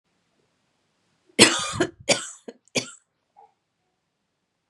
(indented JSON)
{
  "three_cough_length": "4.7 s",
  "three_cough_amplitude": 32768,
  "three_cough_signal_mean_std_ratio": 0.24,
  "survey_phase": "beta (2021-08-13 to 2022-03-07)",
  "age": "18-44",
  "gender": "Female",
  "wearing_mask": "No",
  "symptom_change_to_sense_of_smell_or_taste": true,
  "smoker_status": "Never smoked",
  "respiratory_condition_asthma": false,
  "respiratory_condition_other": false,
  "recruitment_source": "REACT",
  "submission_delay": "1 day",
  "covid_test_result": "Negative",
  "covid_test_method": "RT-qPCR",
  "influenza_a_test_result": "Negative",
  "influenza_b_test_result": "Negative"
}